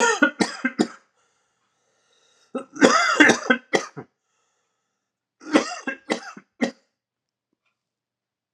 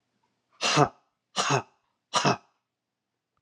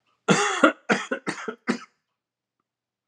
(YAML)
three_cough_length: 8.5 s
three_cough_amplitude: 32768
three_cough_signal_mean_std_ratio: 0.33
exhalation_length: 3.4 s
exhalation_amplitude: 18566
exhalation_signal_mean_std_ratio: 0.35
cough_length: 3.1 s
cough_amplitude: 26077
cough_signal_mean_std_ratio: 0.38
survey_phase: alpha (2021-03-01 to 2021-08-12)
age: 45-64
gender: Male
wearing_mask: 'No'
symptom_cough_any: true
symptom_change_to_sense_of_smell_or_taste: true
smoker_status: Never smoked
respiratory_condition_asthma: false
respiratory_condition_other: false
recruitment_source: Test and Trace
submission_delay: 2 days
covid_test_result: Positive
covid_test_method: RT-qPCR
covid_ct_value: 25.1
covid_ct_gene: N gene